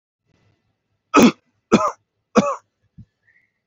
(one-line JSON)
{"three_cough_length": "3.7 s", "three_cough_amplitude": 29532, "three_cough_signal_mean_std_ratio": 0.28, "survey_phase": "beta (2021-08-13 to 2022-03-07)", "age": "45-64", "gender": "Male", "wearing_mask": "No", "symptom_none": true, "smoker_status": "Ex-smoker", "respiratory_condition_asthma": false, "respiratory_condition_other": false, "recruitment_source": "REACT", "submission_delay": "2 days", "covid_test_result": "Negative", "covid_test_method": "RT-qPCR", "influenza_a_test_result": "Negative", "influenza_b_test_result": "Negative"}